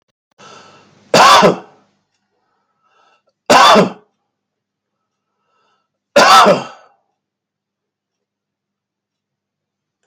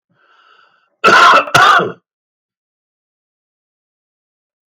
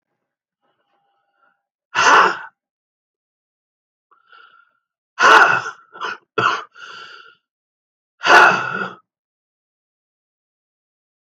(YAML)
three_cough_length: 10.1 s
three_cough_amplitude: 32768
three_cough_signal_mean_std_ratio: 0.31
cough_length: 4.7 s
cough_amplitude: 32768
cough_signal_mean_std_ratio: 0.35
exhalation_length: 11.3 s
exhalation_amplitude: 32767
exhalation_signal_mean_std_ratio: 0.3
survey_phase: alpha (2021-03-01 to 2021-08-12)
age: 65+
gender: Male
wearing_mask: 'No'
symptom_none: true
smoker_status: Never smoked
respiratory_condition_asthma: true
respiratory_condition_other: false
recruitment_source: REACT
submission_delay: 2 days
covid_test_result: Negative
covid_test_method: RT-qPCR